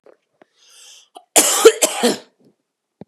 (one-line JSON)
{"cough_length": "3.1 s", "cough_amplitude": 32768, "cough_signal_mean_std_ratio": 0.33, "survey_phase": "beta (2021-08-13 to 2022-03-07)", "age": "18-44", "gender": "Female", "wearing_mask": "No", "symptom_fatigue": true, "smoker_status": "Ex-smoker", "respiratory_condition_asthma": true, "respiratory_condition_other": false, "recruitment_source": "REACT", "submission_delay": "2 days", "covid_test_result": "Negative", "covid_test_method": "RT-qPCR", "influenza_a_test_result": "Negative", "influenza_b_test_result": "Negative"}